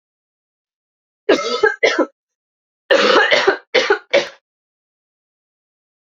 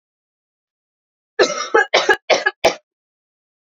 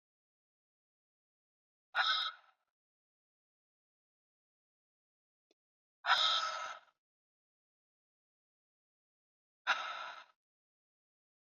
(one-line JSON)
{"three_cough_length": "6.1 s", "three_cough_amplitude": 29110, "three_cough_signal_mean_std_ratio": 0.4, "cough_length": "3.7 s", "cough_amplitude": 29145, "cough_signal_mean_std_ratio": 0.34, "exhalation_length": "11.4 s", "exhalation_amplitude": 4886, "exhalation_signal_mean_std_ratio": 0.26, "survey_phase": "alpha (2021-03-01 to 2021-08-12)", "age": "18-44", "gender": "Female", "wearing_mask": "No", "symptom_cough_any": true, "symptom_fatigue": true, "symptom_fever_high_temperature": true, "symptom_headache": true, "symptom_change_to_sense_of_smell_or_taste": true, "symptom_onset": "4 days", "smoker_status": "Never smoked", "respiratory_condition_asthma": false, "respiratory_condition_other": false, "recruitment_source": "Test and Trace", "submission_delay": "2 days", "covid_test_result": "Positive", "covid_test_method": "RT-qPCR", "covid_ct_value": 14.0, "covid_ct_gene": "ORF1ab gene", "covid_ct_mean": 14.3, "covid_viral_load": "20000000 copies/ml", "covid_viral_load_category": "High viral load (>1M copies/ml)"}